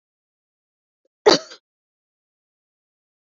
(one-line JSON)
{"cough_length": "3.3 s", "cough_amplitude": 27834, "cough_signal_mean_std_ratio": 0.14, "survey_phase": "beta (2021-08-13 to 2022-03-07)", "age": "45-64", "gender": "Female", "wearing_mask": "No", "symptom_none": true, "smoker_status": "Never smoked", "respiratory_condition_asthma": false, "respiratory_condition_other": false, "recruitment_source": "REACT", "submission_delay": "2 days", "covid_test_result": "Negative", "covid_test_method": "RT-qPCR", "influenza_a_test_result": "Unknown/Void", "influenza_b_test_result": "Unknown/Void"}